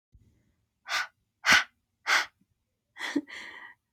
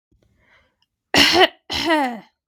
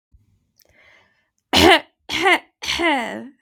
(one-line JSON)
{"exhalation_length": "3.9 s", "exhalation_amplitude": 14935, "exhalation_signal_mean_std_ratio": 0.32, "cough_length": "2.5 s", "cough_amplitude": 32768, "cough_signal_mean_std_ratio": 0.43, "three_cough_length": "3.4 s", "three_cough_amplitude": 32768, "three_cough_signal_mean_std_ratio": 0.41, "survey_phase": "beta (2021-08-13 to 2022-03-07)", "age": "18-44", "gender": "Female", "wearing_mask": "No", "symptom_none": true, "smoker_status": "Current smoker (e-cigarettes or vapes only)", "respiratory_condition_asthma": false, "respiratory_condition_other": false, "recruitment_source": "REACT", "submission_delay": "3 days", "covid_test_result": "Negative", "covid_test_method": "RT-qPCR", "influenza_a_test_result": "Unknown/Void", "influenza_b_test_result": "Unknown/Void"}